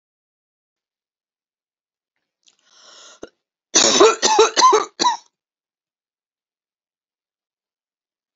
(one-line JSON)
{"cough_length": "8.4 s", "cough_amplitude": 32768, "cough_signal_mean_std_ratio": 0.29, "survey_phase": "beta (2021-08-13 to 2022-03-07)", "age": "45-64", "gender": "Female", "wearing_mask": "No", "symptom_none": true, "smoker_status": "Never smoked", "respiratory_condition_asthma": false, "respiratory_condition_other": false, "recruitment_source": "REACT", "submission_delay": "1 day", "covid_test_result": "Negative", "covid_test_method": "RT-qPCR", "influenza_a_test_result": "Negative", "influenza_b_test_result": "Negative"}